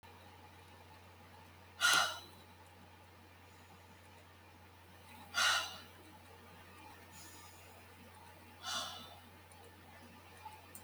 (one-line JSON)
{"exhalation_length": "10.8 s", "exhalation_amplitude": 5397, "exhalation_signal_mean_std_ratio": 0.38, "survey_phase": "beta (2021-08-13 to 2022-03-07)", "age": "65+", "gender": "Female", "wearing_mask": "No", "symptom_none": true, "smoker_status": "Ex-smoker", "respiratory_condition_asthma": false, "respiratory_condition_other": false, "recruitment_source": "REACT", "submission_delay": "2 days", "covid_test_result": "Negative", "covid_test_method": "RT-qPCR", "influenza_a_test_result": "Negative", "influenza_b_test_result": "Negative"}